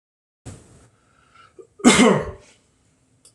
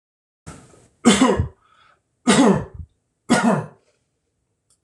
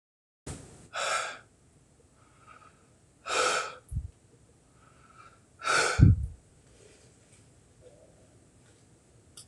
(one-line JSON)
{"cough_length": "3.3 s", "cough_amplitude": 26028, "cough_signal_mean_std_ratio": 0.29, "three_cough_length": "4.8 s", "three_cough_amplitude": 26024, "three_cough_signal_mean_std_ratio": 0.4, "exhalation_length": "9.5 s", "exhalation_amplitude": 19540, "exhalation_signal_mean_std_ratio": 0.3, "survey_phase": "beta (2021-08-13 to 2022-03-07)", "age": "45-64", "gender": "Male", "wearing_mask": "No", "symptom_none": true, "smoker_status": "Ex-smoker", "respiratory_condition_asthma": false, "respiratory_condition_other": false, "recruitment_source": "REACT", "submission_delay": "1 day", "covid_test_result": "Negative", "covid_test_method": "RT-qPCR", "influenza_a_test_result": "Negative", "influenza_b_test_result": "Negative"}